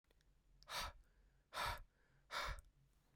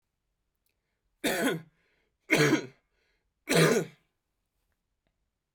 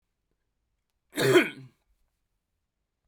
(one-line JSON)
{"exhalation_length": "3.2 s", "exhalation_amplitude": 820, "exhalation_signal_mean_std_ratio": 0.47, "three_cough_length": "5.5 s", "three_cough_amplitude": 11020, "three_cough_signal_mean_std_ratio": 0.34, "cough_length": "3.1 s", "cough_amplitude": 15138, "cough_signal_mean_std_ratio": 0.25, "survey_phase": "beta (2021-08-13 to 2022-03-07)", "age": "18-44", "gender": "Male", "wearing_mask": "No", "symptom_cough_any": true, "symptom_runny_or_blocked_nose": true, "symptom_sore_throat": true, "symptom_fatigue": true, "symptom_change_to_sense_of_smell_or_taste": true, "symptom_onset": "6 days", "smoker_status": "Never smoked", "respiratory_condition_asthma": false, "respiratory_condition_other": false, "recruitment_source": "Test and Trace", "submission_delay": "2 days", "covid_test_result": "Positive", "covid_test_method": "RT-qPCR", "covid_ct_value": 27.0, "covid_ct_gene": "N gene"}